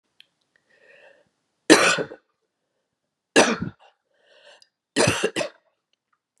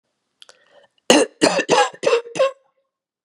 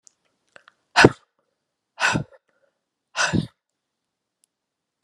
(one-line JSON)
{"three_cough_length": "6.4 s", "three_cough_amplitude": 32521, "three_cough_signal_mean_std_ratio": 0.28, "cough_length": "3.2 s", "cough_amplitude": 32768, "cough_signal_mean_std_ratio": 0.42, "exhalation_length": "5.0 s", "exhalation_amplitude": 32768, "exhalation_signal_mean_std_ratio": 0.23, "survey_phase": "beta (2021-08-13 to 2022-03-07)", "age": "65+", "gender": "Female", "wearing_mask": "No", "symptom_new_continuous_cough": true, "symptom_runny_or_blocked_nose": true, "symptom_headache": true, "symptom_change_to_sense_of_smell_or_taste": true, "symptom_onset": "3 days", "smoker_status": "Never smoked", "respiratory_condition_asthma": false, "respiratory_condition_other": false, "recruitment_source": "Test and Trace", "submission_delay": "1 day", "covid_test_result": "Positive", "covid_test_method": "LAMP"}